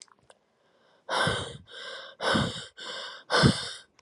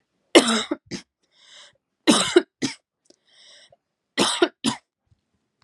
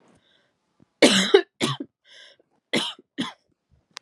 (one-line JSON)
{"exhalation_length": "4.0 s", "exhalation_amplitude": 16298, "exhalation_signal_mean_std_ratio": 0.47, "three_cough_length": "5.6 s", "three_cough_amplitude": 31893, "three_cough_signal_mean_std_ratio": 0.31, "cough_length": "4.0 s", "cough_amplitude": 31376, "cough_signal_mean_std_ratio": 0.3, "survey_phase": "alpha (2021-03-01 to 2021-08-12)", "age": "18-44", "gender": "Female", "wearing_mask": "No", "symptom_cough_any": true, "symptom_fever_high_temperature": true, "symptom_headache": true, "symptom_change_to_sense_of_smell_or_taste": true, "symptom_onset": "3 days", "smoker_status": "Never smoked", "respiratory_condition_asthma": false, "respiratory_condition_other": false, "recruitment_source": "Test and Trace", "submission_delay": "2 days", "covid_test_result": "Positive", "covid_test_method": "RT-qPCR", "covid_ct_value": 16.2, "covid_ct_gene": "N gene", "covid_ct_mean": 16.4, "covid_viral_load": "4100000 copies/ml", "covid_viral_load_category": "High viral load (>1M copies/ml)"}